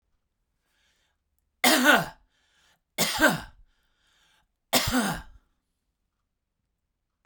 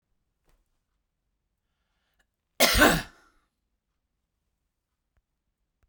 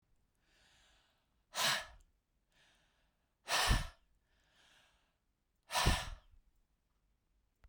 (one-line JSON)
{"three_cough_length": "7.3 s", "three_cough_amplitude": 17394, "three_cough_signal_mean_std_ratio": 0.32, "cough_length": "5.9 s", "cough_amplitude": 21035, "cough_signal_mean_std_ratio": 0.2, "exhalation_length": "7.7 s", "exhalation_amplitude": 4093, "exhalation_signal_mean_std_ratio": 0.3, "survey_phase": "beta (2021-08-13 to 2022-03-07)", "age": "45-64", "gender": "Male", "wearing_mask": "No", "symptom_none": true, "smoker_status": "Never smoked", "respiratory_condition_asthma": false, "respiratory_condition_other": false, "recruitment_source": "REACT", "submission_delay": "5 days", "covid_test_result": "Negative", "covid_test_method": "RT-qPCR", "influenza_a_test_result": "Negative", "influenza_b_test_result": "Negative"}